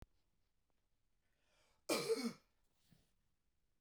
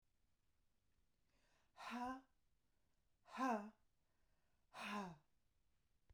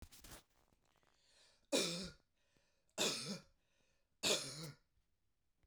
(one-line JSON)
{"cough_length": "3.8 s", "cough_amplitude": 2041, "cough_signal_mean_std_ratio": 0.28, "exhalation_length": "6.1 s", "exhalation_amplitude": 887, "exhalation_signal_mean_std_ratio": 0.35, "three_cough_length": "5.7 s", "three_cough_amplitude": 2490, "three_cough_signal_mean_std_ratio": 0.36, "survey_phase": "beta (2021-08-13 to 2022-03-07)", "age": "45-64", "gender": "Female", "wearing_mask": "No", "symptom_cough_any": true, "symptom_runny_or_blocked_nose": true, "smoker_status": "Never smoked", "respiratory_condition_asthma": true, "respiratory_condition_other": false, "recruitment_source": "REACT", "submission_delay": "3 days", "covid_test_result": "Negative", "covid_test_method": "RT-qPCR", "influenza_a_test_result": "Negative", "influenza_b_test_result": "Negative"}